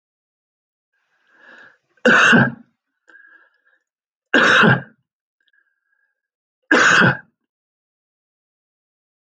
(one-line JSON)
{"three_cough_length": "9.2 s", "three_cough_amplitude": 27215, "three_cough_signal_mean_std_ratio": 0.32, "survey_phase": "alpha (2021-03-01 to 2021-08-12)", "age": "65+", "gender": "Male", "wearing_mask": "No", "symptom_fatigue": true, "symptom_onset": "5 days", "smoker_status": "Never smoked", "respiratory_condition_asthma": false, "respiratory_condition_other": false, "recruitment_source": "REACT", "submission_delay": "1 day", "covid_test_result": "Negative", "covid_test_method": "RT-qPCR"}